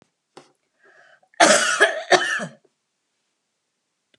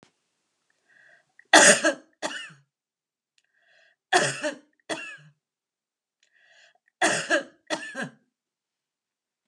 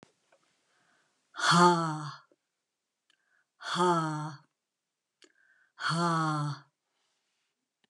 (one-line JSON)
{"cough_length": "4.2 s", "cough_amplitude": 32603, "cough_signal_mean_std_ratio": 0.34, "three_cough_length": "9.5 s", "three_cough_amplitude": 29751, "three_cough_signal_mean_std_ratio": 0.27, "exhalation_length": "7.9 s", "exhalation_amplitude": 11767, "exhalation_signal_mean_std_ratio": 0.38, "survey_phase": "alpha (2021-03-01 to 2021-08-12)", "age": "65+", "gender": "Female", "wearing_mask": "No", "symptom_none": true, "smoker_status": "Never smoked", "respiratory_condition_asthma": false, "respiratory_condition_other": false, "recruitment_source": "REACT", "submission_delay": "2 days", "covid_test_result": "Negative", "covid_test_method": "RT-qPCR"}